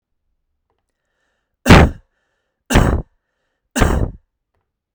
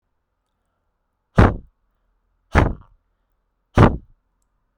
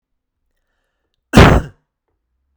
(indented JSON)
{
  "three_cough_length": "4.9 s",
  "three_cough_amplitude": 32768,
  "three_cough_signal_mean_std_ratio": 0.3,
  "exhalation_length": "4.8 s",
  "exhalation_amplitude": 32768,
  "exhalation_signal_mean_std_ratio": 0.24,
  "cough_length": "2.6 s",
  "cough_amplitude": 32768,
  "cough_signal_mean_std_ratio": 0.27,
  "survey_phase": "beta (2021-08-13 to 2022-03-07)",
  "age": "18-44",
  "gender": "Male",
  "wearing_mask": "No",
  "symptom_none": true,
  "symptom_onset": "8 days",
  "smoker_status": "Ex-smoker",
  "recruitment_source": "REACT",
  "submission_delay": "0 days",
  "covid_test_result": "Negative",
  "covid_test_method": "RT-qPCR"
}